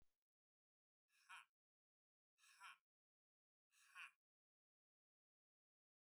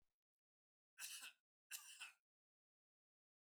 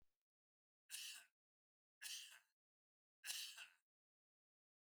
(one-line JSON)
{"exhalation_length": "6.1 s", "exhalation_amplitude": 180, "exhalation_signal_mean_std_ratio": 0.25, "cough_length": "3.6 s", "cough_amplitude": 476, "cough_signal_mean_std_ratio": 0.34, "three_cough_length": "4.9 s", "three_cough_amplitude": 639, "three_cough_signal_mean_std_ratio": 0.36, "survey_phase": "alpha (2021-03-01 to 2021-08-12)", "age": "65+", "gender": "Male", "wearing_mask": "No", "symptom_none": true, "smoker_status": "Ex-smoker", "respiratory_condition_asthma": false, "respiratory_condition_other": false, "recruitment_source": "REACT", "submission_delay": "1 day", "covid_test_result": "Negative", "covid_test_method": "RT-qPCR"}